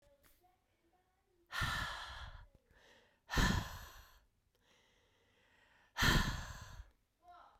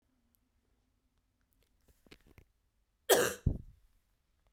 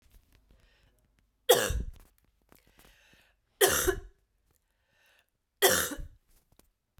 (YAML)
exhalation_length: 7.6 s
exhalation_amplitude: 3840
exhalation_signal_mean_std_ratio: 0.36
cough_length: 4.5 s
cough_amplitude: 8650
cough_signal_mean_std_ratio: 0.21
three_cough_length: 7.0 s
three_cough_amplitude: 15620
three_cough_signal_mean_std_ratio: 0.29
survey_phase: beta (2021-08-13 to 2022-03-07)
age: 45-64
gender: Female
wearing_mask: 'No'
symptom_shortness_of_breath: true
symptom_fatigue: true
symptom_headache: true
smoker_status: Never smoked
respiratory_condition_asthma: false
respiratory_condition_other: false
recruitment_source: Test and Trace
submission_delay: 1 day
covid_test_result: Positive
covid_test_method: ePCR